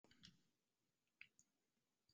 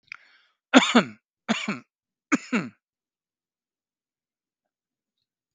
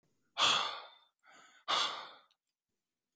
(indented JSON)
{
  "cough_length": "2.1 s",
  "cough_amplitude": 262,
  "cough_signal_mean_std_ratio": 0.35,
  "three_cough_length": "5.5 s",
  "three_cough_amplitude": 32183,
  "three_cough_signal_mean_std_ratio": 0.23,
  "exhalation_length": "3.2 s",
  "exhalation_amplitude": 5482,
  "exhalation_signal_mean_std_ratio": 0.38,
  "survey_phase": "beta (2021-08-13 to 2022-03-07)",
  "age": "45-64",
  "gender": "Male",
  "wearing_mask": "No",
  "symptom_none": true,
  "smoker_status": "Never smoked",
  "respiratory_condition_asthma": false,
  "respiratory_condition_other": false,
  "recruitment_source": "REACT",
  "submission_delay": "3 days",
  "covid_test_result": "Negative",
  "covid_test_method": "RT-qPCR",
  "influenza_a_test_result": "Negative",
  "influenza_b_test_result": "Negative"
}